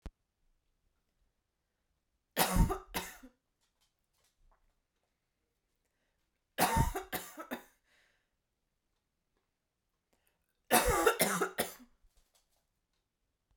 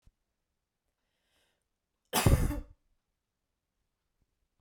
{"three_cough_length": "13.6 s", "three_cough_amplitude": 8623, "three_cough_signal_mean_std_ratio": 0.29, "cough_length": "4.6 s", "cough_amplitude": 8540, "cough_signal_mean_std_ratio": 0.23, "survey_phase": "beta (2021-08-13 to 2022-03-07)", "age": "18-44", "gender": "Female", "wearing_mask": "No", "symptom_none": true, "smoker_status": "Never smoked", "respiratory_condition_asthma": false, "respiratory_condition_other": false, "recruitment_source": "Test and Trace", "submission_delay": "1 day", "covid_test_result": "Negative", "covid_test_method": "RT-qPCR"}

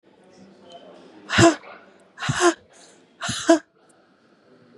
{"exhalation_length": "4.8 s", "exhalation_amplitude": 30236, "exhalation_signal_mean_std_ratio": 0.32, "survey_phase": "beta (2021-08-13 to 2022-03-07)", "age": "45-64", "gender": "Female", "wearing_mask": "No", "symptom_new_continuous_cough": true, "symptom_runny_or_blocked_nose": true, "symptom_diarrhoea": true, "symptom_fatigue": true, "symptom_loss_of_taste": true, "symptom_onset": "5 days", "smoker_status": "Ex-smoker", "respiratory_condition_asthma": false, "respiratory_condition_other": false, "recruitment_source": "Test and Trace", "submission_delay": "3 days", "covid_test_result": "Negative", "covid_test_method": "RT-qPCR"}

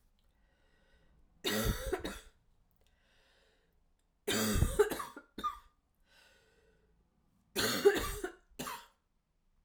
{"three_cough_length": "9.6 s", "three_cough_amplitude": 6621, "three_cough_signal_mean_std_ratio": 0.37, "survey_phase": "alpha (2021-03-01 to 2021-08-12)", "age": "45-64", "gender": "Female", "wearing_mask": "No", "symptom_cough_any": true, "symptom_fatigue": true, "symptom_headache": true, "smoker_status": "Ex-smoker", "respiratory_condition_asthma": false, "respiratory_condition_other": false, "recruitment_source": "Test and Trace", "submission_delay": "1 day", "covid_test_result": "Positive", "covid_test_method": "LFT"}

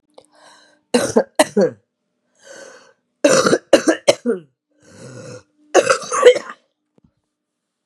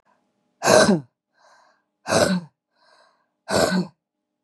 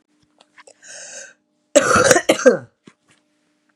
{"three_cough_length": "7.9 s", "three_cough_amplitude": 32768, "three_cough_signal_mean_std_ratio": 0.35, "exhalation_length": "4.4 s", "exhalation_amplitude": 32717, "exhalation_signal_mean_std_ratio": 0.38, "cough_length": "3.8 s", "cough_amplitude": 32768, "cough_signal_mean_std_ratio": 0.34, "survey_phase": "beta (2021-08-13 to 2022-03-07)", "age": "18-44", "gender": "Female", "wearing_mask": "No", "symptom_cough_any": true, "symptom_shortness_of_breath": true, "symptom_sore_throat": true, "symptom_headache": true, "symptom_onset": "3 days", "smoker_status": "Ex-smoker", "respiratory_condition_asthma": false, "respiratory_condition_other": false, "recruitment_source": "Test and Trace", "submission_delay": "2 days", "covid_test_result": "Positive", "covid_test_method": "RT-qPCR", "covid_ct_value": 19.0, "covid_ct_gene": "ORF1ab gene"}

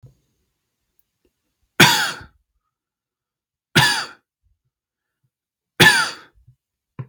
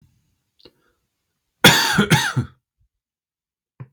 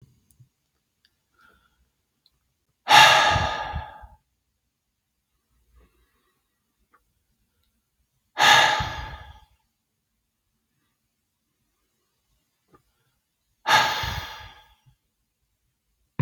{"three_cough_length": "7.1 s", "three_cough_amplitude": 32768, "three_cough_signal_mean_std_ratio": 0.27, "cough_length": "3.9 s", "cough_amplitude": 32768, "cough_signal_mean_std_ratio": 0.32, "exhalation_length": "16.2 s", "exhalation_amplitude": 31843, "exhalation_signal_mean_std_ratio": 0.25, "survey_phase": "beta (2021-08-13 to 2022-03-07)", "age": "18-44", "gender": "Male", "wearing_mask": "No", "symptom_none": true, "symptom_onset": "6 days", "smoker_status": "Never smoked", "respiratory_condition_asthma": false, "respiratory_condition_other": false, "recruitment_source": "REACT", "submission_delay": "1 day", "covid_test_result": "Negative", "covid_test_method": "RT-qPCR", "influenza_a_test_result": "Unknown/Void", "influenza_b_test_result": "Unknown/Void"}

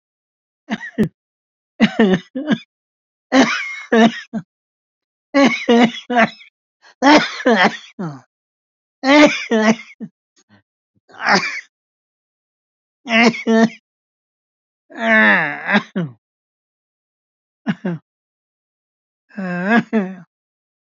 {"three_cough_length": "20.9 s", "three_cough_amplitude": 29902, "three_cough_signal_mean_std_ratio": 0.41, "survey_phase": "beta (2021-08-13 to 2022-03-07)", "age": "65+", "gender": "Male", "wearing_mask": "No", "symptom_cough_any": true, "symptom_runny_or_blocked_nose": true, "symptom_sore_throat": true, "symptom_abdominal_pain": true, "symptom_headache": true, "symptom_onset": "12 days", "smoker_status": "Ex-smoker", "respiratory_condition_asthma": false, "respiratory_condition_other": false, "recruitment_source": "REACT", "submission_delay": "3 days", "covid_test_result": "Negative", "covid_test_method": "RT-qPCR", "influenza_a_test_result": "Negative", "influenza_b_test_result": "Negative"}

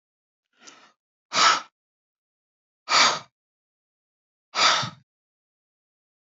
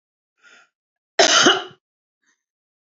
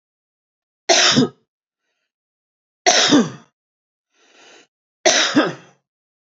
{"exhalation_length": "6.2 s", "exhalation_amplitude": 17609, "exhalation_signal_mean_std_ratio": 0.29, "cough_length": "2.9 s", "cough_amplitude": 28693, "cough_signal_mean_std_ratio": 0.3, "three_cough_length": "6.4 s", "three_cough_amplitude": 32767, "three_cough_signal_mean_std_ratio": 0.36, "survey_phase": "beta (2021-08-13 to 2022-03-07)", "age": "45-64", "gender": "Female", "wearing_mask": "No", "symptom_none": true, "smoker_status": "Ex-smoker", "respiratory_condition_asthma": false, "respiratory_condition_other": false, "recruitment_source": "REACT", "submission_delay": "2 days", "covid_test_result": "Negative", "covid_test_method": "RT-qPCR", "influenza_a_test_result": "Negative", "influenza_b_test_result": "Negative"}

